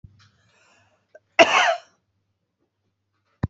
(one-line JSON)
{"cough_length": "3.5 s", "cough_amplitude": 32767, "cough_signal_mean_std_ratio": 0.24, "survey_phase": "beta (2021-08-13 to 2022-03-07)", "age": "45-64", "gender": "Female", "wearing_mask": "No", "symptom_cough_any": true, "symptom_runny_or_blocked_nose": true, "symptom_shortness_of_breath": true, "symptom_abdominal_pain": true, "symptom_fever_high_temperature": true, "symptom_change_to_sense_of_smell_or_taste": true, "symptom_onset": "3 days", "smoker_status": "Current smoker (1 to 10 cigarettes per day)", "respiratory_condition_asthma": false, "respiratory_condition_other": false, "recruitment_source": "Test and Trace", "submission_delay": "2 days", "covid_test_result": "Positive", "covid_test_method": "RT-qPCR", "covid_ct_value": 25.3, "covid_ct_gene": "ORF1ab gene"}